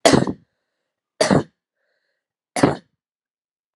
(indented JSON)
{
  "three_cough_length": "3.8 s",
  "three_cough_amplitude": 32768,
  "three_cough_signal_mean_std_ratio": 0.29,
  "survey_phase": "alpha (2021-03-01 to 2021-08-12)",
  "age": "18-44",
  "gender": "Female",
  "wearing_mask": "No",
  "symptom_none": true,
  "smoker_status": "Ex-smoker",
  "respiratory_condition_asthma": false,
  "respiratory_condition_other": false,
  "recruitment_source": "REACT",
  "submission_delay": "1 day",
  "covid_test_result": "Negative",
  "covid_test_method": "RT-qPCR"
}